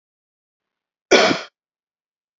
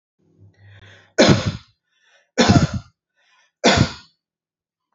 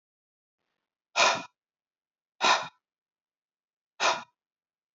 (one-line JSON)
{"cough_length": "2.4 s", "cough_amplitude": 29422, "cough_signal_mean_std_ratio": 0.26, "three_cough_length": "4.9 s", "three_cough_amplitude": 32767, "three_cough_signal_mean_std_ratio": 0.34, "exhalation_length": "4.9 s", "exhalation_amplitude": 12636, "exhalation_signal_mean_std_ratio": 0.28, "survey_phase": "beta (2021-08-13 to 2022-03-07)", "age": "18-44", "gender": "Male", "wearing_mask": "No", "symptom_none": true, "smoker_status": "Never smoked", "respiratory_condition_asthma": false, "respiratory_condition_other": false, "recruitment_source": "REACT", "submission_delay": "1 day", "covid_test_result": "Negative", "covid_test_method": "RT-qPCR", "influenza_a_test_result": "Negative", "influenza_b_test_result": "Negative"}